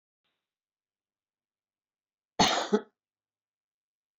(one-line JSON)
{"cough_length": "4.2 s", "cough_amplitude": 11830, "cough_signal_mean_std_ratio": 0.21, "survey_phase": "alpha (2021-03-01 to 2021-08-12)", "age": "65+", "gender": "Female", "wearing_mask": "No", "symptom_none": true, "smoker_status": "Ex-smoker", "respiratory_condition_asthma": false, "respiratory_condition_other": false, "recruitment_source": "REACT", "covid_test_method": "RT-qPCR"}